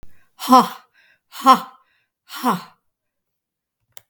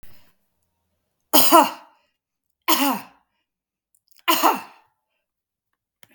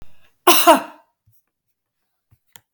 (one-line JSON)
{"exhalation_length": "4.1 s", "exhalation_amplitude": 32768, "exhalation_signal_mean_std_ratio": 0.28, "three_cough_length": "6.1 s", "three_cough_amplitude": 32768, "three_cough_signal_mean_std_ratio": 0.3, "cough_length": "2.7 s", "cough_amplitude": 32768, "cough_signal_mean_std_ratio": 0.28, "survey_phase": "beta (2021-08-13 to 2022-03-07)", "age": "65+", "gender": "Female", "wearing_mask": "No", "symptom_runny_or_blocked_nose": true, "symptom_shortness_of_breath": true, "smoker_status": "Never smoked", "respiratory_condition_asthma": false, "respiratory_condition_other": false, "recruitment_source": "REACT", "submission_delay": "1 day", "covid_test_result": "Negative", "covid_test_method": "RT-qPCR", "influenza_a_test_result": "Negative", "influenza_b_test_result": "Negative"}